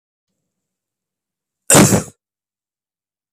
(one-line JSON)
{"cough_length": "3.3 s", "cough_amplitude": 32768, "cough_signal_mean_std_ratio": 0.25, "survey_phase": "beta (2021-08-13 to 2022-03-07)", "age": "18-44", "gender": "Male", "wearing_mask": "No", "symptom_cough_any": true, "symptom_runny_or_blocked_nose": true, "symptom_change_to_sense_of_smell_or_taste": true, "smoker_status": "Current smoker (1 to 10 cigarettes per day)", "respiratory_condition_asthma": false, "respiratory_condition_other": false, "recruitment_source": "Test and Trace", "submission_delay": "2 days", "covid_test_result": "Positive", "covid_test_method": "RT-qPCR", "covid_ct_value": 30.0, "covid_ct_gene": "N gene"}